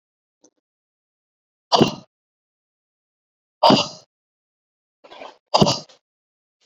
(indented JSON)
{
  "exhalation_length": "6.7 s",
  "exhalation_amplitude": 30118,
  "exhalation_signal_mean_std_ratio": 0.23,
  "survey_phase": "beta (2021-08-13 to 2022-03-07)",
  "age": "18-44",
  "gender": "Female",
  "wearing_mask": "No",
  "symptom_fatigue": true,
  "symptom_onset": "12 days",
  "smoker_status": "Current smoker (e-cigarettes or vapes only)",
  "respiratory_condition_asthma": true,
  "respiratory_condition_other": false,
  "recruitment_source": "REACT",
  "submission_delay": "5 days",
  "covid_test_result": "Negative",
  "covid_test_method": "RT-qPCR"
}